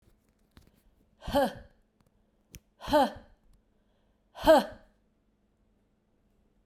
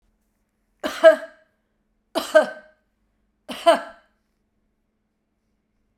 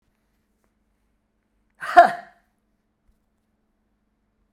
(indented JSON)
{
  "exhalation_length": "6.7 s",
  "exhalation_amplitude": 12684,
  "exhalation_signal_mean_std_ratio": 0.25,
  "three_cough_length": "6.0 s",
  "three_cough_amplitude": 30439,
  "three_cough_signal_mean_std_ratio": 0.23,
  "cough_length": "4.5 s",
  "cough_amplitude": 32768,
  "cough_signal_mean_std_ratio": 0.15,
  "survey_phase": "beta (2021-08-13 to 2022-03-07)",
  "age": "65+",
  "gender": "Female",
  "wearing_mask": "No",
  "symptom_none": true,
  "smoker_status": "Ex-smoker",
  "respiratory_condition_asthma": false,
  "respiratory_condition_other": false,
  "recruitment_source": "REACT",
  "submission_delay": "1 day",
  "covid_test_result": "Negative",
  "covid_test_method": "RT-qPCR"
}